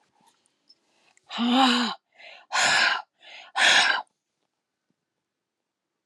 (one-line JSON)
{"exhalation_length": "6.1 s", "exhalation_amplitude": 17226, "exhalation_signal_mean_std_ratio": 0.42, "survey_phase": "alpha (2021-03-01 to 2021-08-12)", "age": "45-64", "gender": "Female", "wearing_mask": "No", "symptom_none": true, "smoker_status": "Never smoked", "respiratory_condition_asthma": false, "respiratory_condition_other": false, "recruitment_source": "REACT", "submission_delay": "4 days", "covid_test_result": "Negative", "covid_test_method": "RT-qPCR"}